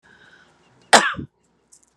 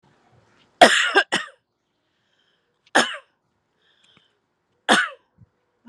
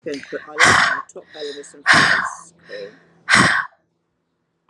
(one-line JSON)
{"cough_length": "2.0 s", "cough_amplitude": 32768, "cough_signal_mean_std_ratio": 0.23, "three_cough_length": "5.9 s", "three_cough_amplitude": 32768, "three_cough_signal_mean_std_ratio": 0.26, "exhalation_length": "4.7 s", "exhalation_amplitude": 32767, "exhalation_signal_mean_std_ratio": 0.47, "survey_phase": "alpha (2021-03-01 to 2021-08-12)", "age": "18-44", "gender": "Female", "wearing_mask": "No", "symptom_change_to_sense_of_smell_or_taste": true, "smoker_status": "Ex-smoker", "respiratory_condition_asthma": false, "respiratory_condition_other": false, "recruitment_source": "REACT", "submission_delay": "4 days", "covid_test_result": "Negative", "covid_test_method": "RT-qPCR"}